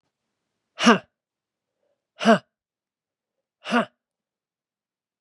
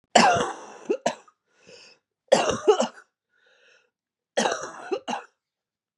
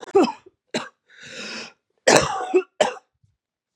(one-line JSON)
{"exhalation_length": "5.2 s", "exhalation_amplitude": 30631, "exhalation_signal_mean_std_ratio": 0.21, "three_cough_length": "6.0 s", "three_cough_amplitude": 28826, "three_cough_signal_mean_std_ratio": 0.37, "cough_length": "3.8 s", "cough_amplitude": 32768, "cough_signal_mean_std_ratio": 0.38, "survey_phase": "beta (2021-08-13 to 2022-03-07)", "age": "18-44", "gender": "Female", "wearing_mask": "No", "symptom_cough_any": true, "symptom_runny_or_blocked_nose": true, "symptom_sore_throat": true, "symptom_fatigue": true, "symptom_headache": true, "symptom_change_to_sense_of_smell_or_taste": true, "symptom_onset": "4 days", "smoker_status": "Never smoked", "respiratory_condition_asthma": false, "respiratory_condition_other": false, "recruitment_source": "Test and Trace", "submission_delay": "3 days", "covid_test_result": "Positive", "covid_test_method": "RT-qPCR"}